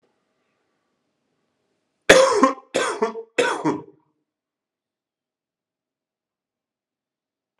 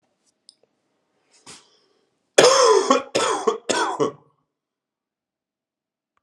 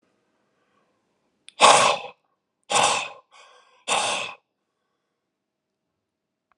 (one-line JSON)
{"three_cough_length": "7.6 s", "three_cough_amplitude": 32768, "three_cough_signal_mean_std_ratio": 0.27, "cough_length": "6.2 s", "cough_amplitude": 32768, "cough_signal_mean_std_ratio": 0.35, "exhalation_length": "6.6 s", "exhalation_amplitude": 32725, "exhalation_signal_mean_std_ratio": 0.3, "survey_phase": "alpha (2021-03-01 to 2021-08-12)", "age": "45-64", "gender": "Male", "wearing_mask": "No", "symptom_cough_any": true, "symptom_headache": true, "symptom_change_to_sense_of_smell_or_taste": true, "symptom_loss_of_taste": true, "smoker_status": "Ex-smoker", "respiratory_condition_asthma": false, "respiratory_condition_other": false, "recruitment_source": "Test and Trace", "submission_delay": "2 days", "covid_test_result": "Positive", "covid_test_method": "RT-qPCR", "covid_ct_value": 18.0, "covid_ct_gene": "N gene", "covid_ct_mean": 18.5, "covid_viral_load": "890000 copies/ml", "covid_viral_load_category": "Low viral load (10K-1M copies/ml)"}